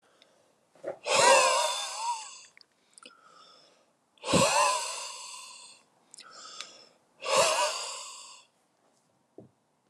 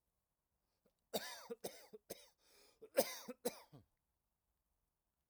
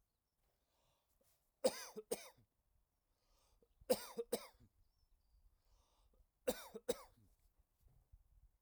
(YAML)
exhalation_length: 9.9 s
exhalation_amplitude: 13736
exhalation_signal_mean_std_ratio: 0.43
cough_length: 5.3 s
cough_amplitude: 2988
cough_signal_mean_std_ratio: 0.26
three_cough_length: 8.6 s
three_cough_amplitude: 2708
three_cough_signal_mean_std_ratio: 0.23
survey_phase: alpha (2021-03-01 to 2021-08-12)
age: 45-64
gender: Male
wearing_mask: 'No'
symptom_none: true
smoker_status: Ex-smoker
respiratory_condition_asthma: true
respiratory_condition_other: false
recruitment_source: Test and Trace
submission_delay: 0 days
covid_test_result: Negative
covid_test_method: LFT